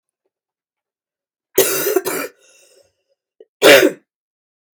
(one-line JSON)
{"cough_length": "4.7 s", "cough_amplitude": 32767, "cough_signal_mean_std_ratio": 0.31, "survey_phase": "beta (2021-08-13 to 2022-03-07)", "age": "45-64", "gender": "Female", "wearing_mask": "No", "symptom_cough_any": true, "symptom_new_continuous_cough": true, "symptom_sore_throat": true, "symptom_fever_high_temperature": true, "symptom_headache": true, "symptom_onset": "2 days", "smoker_status": "Never smoked", "respiratory_condition_asthma": false, "respiratory_condition_other": false, "recruitment_source": "Test and Trace", "submission_delay": "1 day", "covid_test_result": "Positive", "covid_test_method": "RT-qPCR", "covid_ct_value": 27.0, "covid_ct_gene": "N gene", "covid_ct_mean": 27.0, "covid_viral_load": "1300 copies/ml", "covid_viral_load_category": "Minimal viral load (< 10K copies/ml)"}